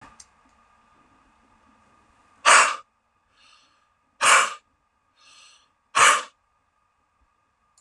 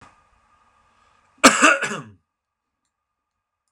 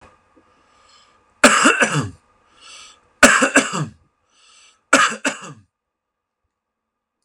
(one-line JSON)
{"exhalation_length": "7.8 s", "exhalation_amplitude": 29085, "exhalation_signal_mean_std_ratio": 0.26, "cough_length": "3.7 s", "cough_amplitude": 32768, "cough_signal_mean_std_ratio": 0.25, "three_cough_length": "7.2 s", "three_cough_amplitude": 32768, "three_cough_signal_mean_std_ratio": 0.33, "survey_phase": "beta (2021-08-13 to 2022-03-07)", "age": "45-64", "gender": "Male", "wearing_mask": "No", "symptom_none": true, "smoker_status": "Never smoked", "respiratory_condition_asthma": true, "respiratory_condition_other": false, "recruitment_source": "REACT", "submission_delay": "2 days", "covid_test_result": "Negative", "covid_test_method": "RT-qPCR", "influenza_a_test_result": "Negative", "influenza_b_test_result": "Negative"}